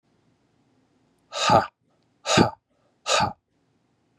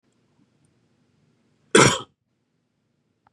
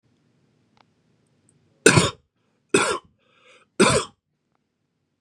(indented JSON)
{
  "exhalation_length": "4.2 s",
  "exhalation_amplitude": 22824,
  "exhalation_signal_mean_std_ratio": 0.32,
  "cough_length": "3.3 s",
  "cough_amplitude": 30174,
  "cough_signal_mean_std_ratio": 0.2,
  "three_cough_length": "5.2 s",
  "three_cough_amplitude": 32767,
  "three_cough_signal_mean_std_ratio": 0.27,
  "survey_phase": "beta (2021-08-13 to 2022-03-07)",
  "age": "18-44",
  "gender": "Male",
  "wearing_mask": "No",
  "symptom_cough_any": true,
  "symptom_runny_or_blocked_nose": true,
  "symptom_sore_throat": true,
  "symptom_fatigue": true,
  "smoker_status": "Never smoked",
  "respiratory_condition_asthma": false,
  "respiratory_condition_other": false,
  "recruitment_source": "REACT",
  "submission_delay": "4 days",
  "covid_test_result": "Negative",
  "covid_test_method": "RT-qPCR",
  "influenza_a_test_result": "Negative",
  "influenza_b_test_result": "Negative"
}